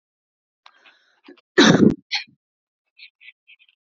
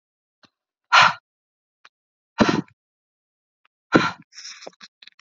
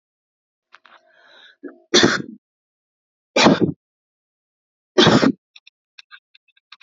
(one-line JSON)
{"cough_length": "3.8 s", "cough_amplitude": 30073, "cough_signal_mean_std_ratio": 0.26, "exhalation_length": "5.2 s", "exhalation_amplitude": 29573, "exhalation_signal_mean_std_ratio": 0.25, "three_cough_length": "6.8 s", "three_cough_amplitude": 28648, "three_cough_signal_mean_std_ratio": 0.29, "survey_phase": "beta (2021-08-13 to 2022-03-07)", "age": "18-44", "gender": "Female", "wearing_mask": "No", "symptom_none": true, "smoker_status": "Ex-smoker", "respiratory_condition_asthma": true, "respiratory_condition_other": false, "recruitment_source": "REACT", "submission_delay": "2 days", "covid_test_result": "Negative", "covid_test_method": "RT-qPCR", "influenza_a_test_result": "Negative", "influenza_b_test_result": "Negative"}